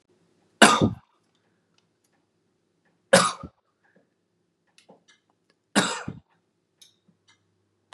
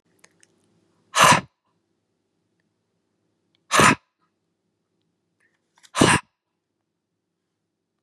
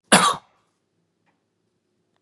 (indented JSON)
{
  "three_cough_length": "7.9 s",
  "three_cough_amplitude": 32767,
  "three_cough_signal_mean_std_ratio": 0.21,
  "exhalation_length": "8.0 s",
  "exhalation_amplitude": 32768,
  "exhalation_signal_mean_std_ratio": 0.23,
  "cough_length": "2.2 s",
  "cough_amplitude": 31897,
  "cough_signal_mean_std_ratio": 0.24,
  "survey_phase": "beta (2021-08-13 to 2022-03-07)",
  "age": "18-44",
  "gender": "Male",
  "wearing_mask": "No",
  "symptom_cough_any": true,
  "symptom_fatigue": true,
  "symptom_headache": true,
  "symptom_change_to_sense_of_smell_or_taste": true,
  "symptom_onset": "3 days",
  "smoker_status": "Never smoked",
  "respiratory_condition_asthma": false,
  "respiratory_condition_other": false,
  "recruitment_source": "Test and Trace",
  "submission_delay": "2 days",
  "covid_test_result": "Positive",
  "covid_test_method": "RT-qPCR",
  "covid_ct_value": 17.0,
  "covid_ct_gene": "ORF1ab gene",
  "covid_ct_mean": 17.4,
  "covid_viral_load": "1900000 copies/ml",
  "covid_viral_load_category": "High viral load (>1M copies/ml)"
}